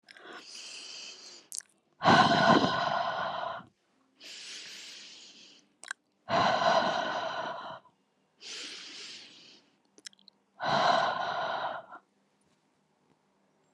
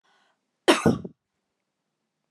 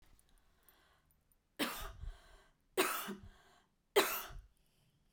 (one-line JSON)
{"exhalation_length": "13.7 s", "exhalation_amplitude": 13798, "exhalation_signal_mean_std_ratio": 0.46, "cough_length": "2.3 s", "cough_amplitude": 23688, "cough_signal_mean_std_ratio": 0.25, "three_cough_length": "5.1 s", "three_cough_amplitude": 5188, "three_cough_signal_mean_std_ratio": 0.34, "survey_phase": "beta (2021-08-13 to 2022-03-07)", "age": "45-64", "gender": "Female", "wearing_mask": "No", "symptom_none": true, "smoker_status": "Ex-smoker", "respiratory_condition_asthma": false, "respiratory_condition_other": false, "recruitment_source": "REACT", "submission_delay": "3 days", "covid_test_result": "Negative", "covid_test_method": "RT-qPCR", "influenza_a_test_result": "Negative", "influenza_b_test_result": "Negative"}